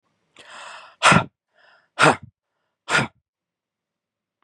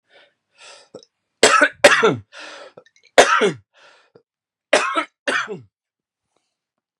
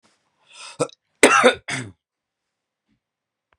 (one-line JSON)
{"exhalation_length": "4.4 s", "exhalation_amplitude": 30522, "exhalation_signal_mean_std_ratio": 0.27, "three_cough_length": "7.0 s", "three_cough_amplitude": 32768, "three_cough_signal_mean_std_ratio": 0.34, "cough_length": "3.6 s", "cough_amplitude": 32767, "cough_signal_mean_std_ratio": 0.27, "survey_phase": "beta (2021-08-13 to 2022-03-07)", "age": "18-44", "gender": "Male", "wearing_mask": "No", "symptom_cough_any": true, "symptom_sore_throat": true, "smoker_status": "Current smoker (1 to 10 cigarettes per day)", "respiratory_condition_asthma": false, "respiratory_condition_other": false, "recruitment_source": "Test and Trace", "submission_delay": "1 day", "covid_test_result": "Positive", "covid_test_method": "LFT"}